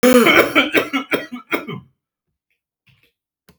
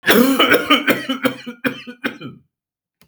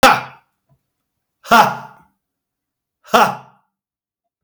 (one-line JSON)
{"three_cough_length": "3.6 s", "three_cough_amplitude": 32768, "three_cough_signal_mean_std_ratio": 0.43, "cough_length": "3.1 s", "cough_amplitude": 32768, "cough_signal_mean_std_ratio": 0.53, "exhalation_length": "4.4 s", "exhalation_amplitude": 32768, "exhalation_signal_mean_std_ratio": 0.29, "survey_phase": "beta (2021-08-13 to 2022-03-07)", "age": "45-64", "gender": "Male", "wearing_mask": "No", "symptom_none": true, "smoker_status": "Never smoked", "respiratory_condition_asthma": false, "respiratory_condition_other": false, "recruitment_source": "REACT", "submission_delay": "6 days", "covid_test_result": "Negative", "covid_test_method": "RT-qPCR", "influenza_a_test_result": "Negative", "influenza_b_test_result": "Negative"}